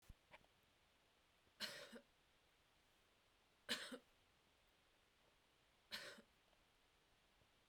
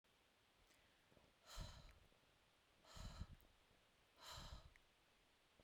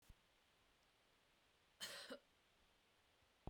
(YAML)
three_cough_length: 7.7 s
three_cough_amplitude: 912
three_cough_signal_mean_std_ratio: 0.34
exhalation_length: 5.6 s
exhalation_amplitude: 1384
exhalation_signal_mean_std_ratio: 0.47
cough_length: 3.5 s
cough_amplitude: 606
cough_signal_mean_std_ratio: 0.39
survey_phase: beta (2021-08-13 to 2022-03-07)
age: 18-44
gender: Female
wearing_mask: 'No'
symptom_none: true
smoker_status: Never smoked
respiratory_condition_asthma: false
respiratory_condition_other: false
recruitment_source: REACT
submission_delay: 1 day
covid_test_result: Negative
covid_test_method: RT-qPCR
influenza_a_test_result: Negative
influenza_b_test_result: Negative